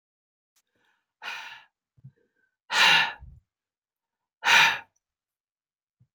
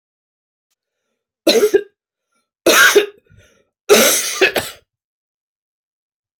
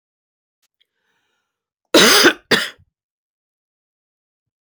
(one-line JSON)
{"exhalation_length": "6.1 s", "exhalation_amplitude": 16032, "exhalation_signal_mean_std_ratio": 0.28, "three_cough_length": "6.4 s", "three_cough_amplitude": 32768, "three_cough_signal_mean_std_ratio": 0.36, "cough_length": "4.6 s", "cough_amplitude": 30010, "cough_signal_mean_std_ratio": 0.27, "survey_phase": "beta (2021-08-13 to 2022-03-07)", "age": "45-64", "gender": "Female", "wearing_mask": "No", "symptom_cough_any": true, "symptom_runny_or_blocked_nose": true, "symptom_sore_throat": true, "symptom_diarrhoea": true, "symptom_fatigue": true, "symptom_headache": true, "symptom_other": true, "smoker_status": "Ex-smoker", "respiratory_condition_asthma": false, "respiratory_condition_other": false, "recruitment_source": "Test and Trace", "submission_delay": "1 day", "covid_test_result": "Positive", "covid_test_method": "RT-qPCR", "covid_ct_value": 14.8, "covid_ct_gene": "ORF1ab gene", "covid_ct_mean": 15.1, "covid_viral_load": "11000000 copies/ml", "covid_viral_load_category": "High viral load (>1M copies/ml)"}